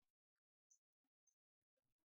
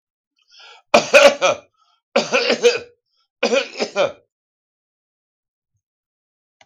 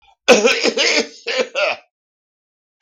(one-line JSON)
{"exhalation_length": "2.1 s", "exhalation_amplitude": 28, "exhalation_signal_mean_std_ratio": 0.23, "three_cough_length": "6.7 s", "three_cough_amplitude": 32768, "three_cough_signal_mean_std_ratio": 0.34, "cough_length": "2.8 s", "cough_amplitude": 32768, "cough_signal_mean_std_ratio": 0.5, "survey_phase": "beta (2021-08-13 to 2022-03-07)", "age": "65+", "gender": "Male", "wearing_mask": "No", "symptom_none": true, "smoker_status": "Ex-smoker", "respiratory_condition_asthma": false, "respiratory_condition_other": false, "recruitment_source": "REACT", "submission_delay": "2 days", "covid_test_result": "Negative", "covid_test_method": "RT-qPCR"}